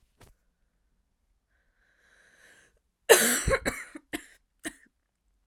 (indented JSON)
{
  "cough_length": "5.5 s",
  "cough_amplitude": 23225,
  "cough_signal_mean_std_ratio": 0.24,
  "survey_phase": "beta (2021-08-13 to 2022-03-07)",
  "age": "18-44",
  "gender": "Female",
  "wearing_mask": "No",
  "symptom_runny_or_blocked_nose": true,
  "symptom_sore_throat": true,
  "symptom_fatigue": true,
  "symptom_change_to_sense_of_smell_or_taste": true,
  "symptom_loss_of_taste": true,
  "smoker_status": "Never smoked",
  "respiratory_condition_asthma": true,
  "respiratory_condition_other": false,
  "recruitment_source": "Test and Trace",
  "submission_delay": "2 days",
  "covid_test_result": "Positive",
  "covid_test_method": "RT-qPCR",
  "covid_ct_value": 22.6,
  "covid_ct_gene": "ORF1ab gene",
  "covid_ct_mean": 23.0,
  "covid_viral_load": "28000 copies/ml",
  "covid_viral_load_category": "Low viral load (10K-1M copies/ml)"
}